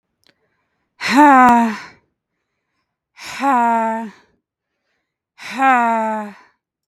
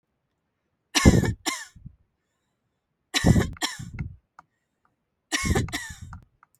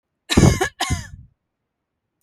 {"exhalation_length": "6.9 s", "exhalation_amplitude": 32768, "exhalation_signal_mean_std_ratio": 0.44, "three_cough_length": "6.6 s", "three_cough_amplitude": 23029, "three_cough_signal_mean_std_ratio": 0.34, "cough_length": "2.2 s", "cough_amplitude": 32743, "cough_signal_mean_std_ratio": 0.35, "survey_phase": "beta (2021-08-13 to 2022-03-07)", "age": "45-64", "gender": "Female", "wearing_mask": "No", "symptom_none": true, "smoker_status": "Ex-smoker", "respiratory_condition_asthma": false, "respiratory_condition_other": false, "recruitment_source": "REACT", "submission_delay": "3 days", "covid_test_result": "Negative", "covid_test_method": "RT-qPCR", "influenza_a_test_result": "Negative", "influenza_b_test_result": "Negative"}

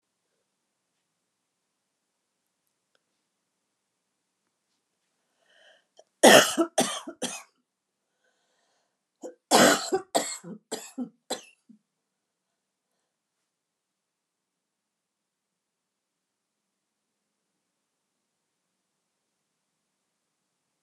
{"cough_length": "20.8 s", "cough_amplitude": 28359, "cough_signal_mean_std_ratio": 0.17, "survey_phase": "alpha (2021-03-01 to 2021-08-12)", "age": "65+", "gender": "Female", "wearing_mask": "No", "symptom_none": true, "smoker_status": "Never smoked", "respiratory_condition_asthma": false, "respiratory_condition_other": false, "recruitment_source": "REACT", "submission_delay": "1 day", "covid_test_result": "Negative", "covid_test_method": "RT-qPCR"}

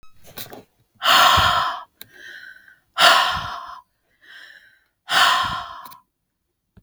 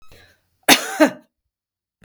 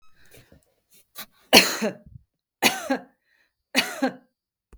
{"exhalation_length": "6.8 s", "exhalation_amplitude": 32766, "exhalation_signal_mean_std_ratio": 0.43, "cough_length": "2.0 s", "cough_amplitude": 32768, "cough_signal_mean_std_ratio": 0.28, "three_cough_length": "4.8 s", "three_cough_amplitude": 32768, "three_cough_signal_mean_std_ratio": 0.3, "survey_phase": "beta (2021-08-13 to 2022-03-07)", "age": "45-64", "gender": "Female", "wearing_mask": "No", "symptom_none": true, "smoker_status": "Ex-smoker", "respiratory_condition_asthma": false, "respiratory_condition_other": false, "recruitment_source": "REACT", "submission_delay": "2 days", "covid_test_result": "Negative", "covid_test_method": "RT-qPCR", "influenza_a_test_result": "Negative", "influenza_b_test_result": "Negative"}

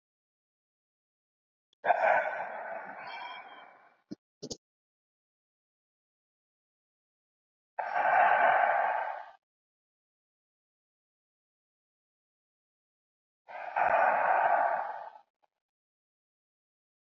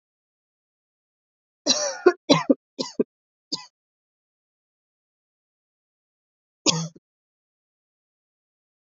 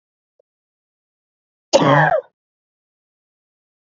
{"exhalation_length": "17.1 s", "exhalation_amplitude": 8525, "exhalation_signal_mean_std_ratio": 0.37, "three_cough_length": "9.0 s", "three_cough_amplitude": 26900, "three_cough_signal_mean_std_ratio": 0.2, "cough_length": "3.8 s", "cough_amplitude": 29571, "cough_signal_mean_std_ratio": 0.28, "survey_phase": "beta (2021-08-13 to 2022-03-07)", "age": "18-44", "gender": "Female", "wearing_mask": "No", "symptom_cough_any": true, "symptom_runny_or_blocked_nose": true, "symptom_shortness_of_breath": true, "symptom_sore_throat": true, "symptom_fatigue": true, "symptom_headache": true, "smoker_status": "Current smoker (e-cigarettes or vapes only)", "respiratory_condition_asthma": false, "respiratory_condition_other": false, "recruitment_source": "Test and Trace", "submission_delay": "1 day", "covid_test_result": "Positive", "covid_test_method": "LFT"}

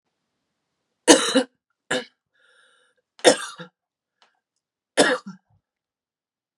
{"three_cough_length": "6.6 s", "three_cough_amplitude": 32767, "three_cough_signal_mean_std_ratio": 0.24, "survey_phase": "beta (2021-08-13 to 2022-03-07)", "age": "18-44", "gender": "Female", "wearing_mask": "No", "symptom_cough_any": true, "symptom_new_continuous_cough": true, "symptom_runny_or_blocked_nose": true, "symptom_shortness_of_breath": true, "symptom_diarrhoea": true, "symptom_fatigue": true, "symptom_headache": true, "symptom_onset": "4 days", "smoker_status": "Never smoked", "respiratory_condition_asthma": false, "respiratory_condition_other": false, "recruitment_source": "Test and Trace", "submission_delay": "2 days", "covid_test_result": "Positive", "covid_test_method": "RT-qPCR", "covid_ct_value": 20.4, "covid_ct_gene": "ORF1ab gene"}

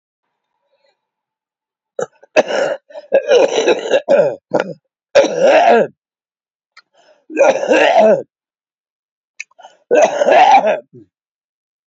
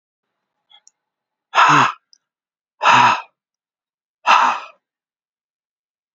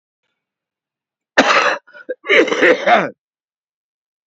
{"three_cough_length": "11.9 s", "three_cough_amplitude": 29940, "three_cough_signal_mean_std_ratio": 0.49, "exhalation_length": "6.1 s", "exhalation_amplitude": 32768, "exhalation_signal_mean_std_ratio": 0.33, "cough_length": "4.3 s", "cough_amplitude": 32767, "cough_signal_mean_std_ratio": 0.41, "survey_phase": "beta (2021-08-13 to 2022-03-07)", "age": "45-64", "gender": "Male", "wearing_mask": "No", "symptom_cough_any": true, "symptom_runny_or_blocked_nose": true, "symptom_change_to_sense_of_smell_or_taste": true, "smoker_status": "Current smoker (11 or more cigarettes per day)", "respiratory_condition_asthma": true, "respiratory_condition_other": true, "recruitment_source": "Test and Trace", "submission_delay": "2 days", "covid_test_result": "Positive", "covid_test_method": "RT-qPCR", "covid_ct_value": 13.2, "covid_ct_gene": "ORF1ab gene", "covid_ct_mean": 13.4, "covid_viral_load": "41000000 copies/ml", "covid_viral_load_category": "High viral load (>1M copies/ml)"}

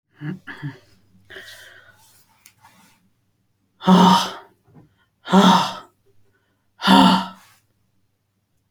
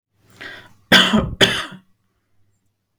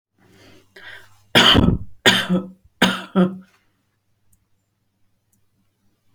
{"exhalation_length": "8.7 s", "exhalation_amplitude": 28209, "exhalation_signal_mean_std_ratio": 0.33, "cough_length": "3.0 s", "cough_amplitude": 31367, "cough_signal_mean_std_ratio": 0.35, "three_cough_length": "6.1 s", "three_cough_amplitude": 30512, "three_cough_signal_mean_std_ratio": 0.35, "survey_phase": "beta (2021-08-13 to 2022-03-07)", "age": "45-64", "gender": "Female", "wearing_mask": "No", "symptom_none": true, "smoker_status": "Never smoked", "respiratory_condition_asthma": false, "respiratory_condition_other": false, "recruitment_source": "REACT", "submission_delay": "1 day", "covid_test_result": "Negative", "covid_test_method": "RT-qPCR"}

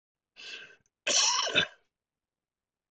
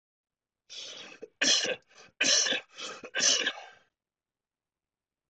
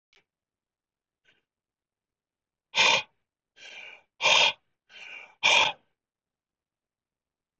{"cough_length": "2.9 s", "cough_amplitude": 8987, "cough_signal_mean_std_ratio": 0.38, "three_cough_length": "5.3 s", "three_cough_amplitude": 10409, "three_cough_signal_mean_std_ratio": 0.41, "exhalation_length": "7.6 s", "exhalation_amplitude": 15281, "exhalation_signal_mean_std_ratio": 0.28, "survey_phase": "beta (2021-08-13 to 2022-03-07)", "age": "65+", "gender": "Male", "wearing_mask": "No", "symptom_fatigue": true, "symptom_headache": true, "symptom_onset": "6 days", "smoker_status": "Never smoked", "respiratory_condition_asthma": false, "respiratory_condition_other": false, "recruitment_source": "REACT", "submission_delay": "2 days", "covid_test_result": "Negative", "covid_test_method": "RT-qPCR", "influenza_a_test_result": "Negative", "influenza_b_test_result": "Negative"}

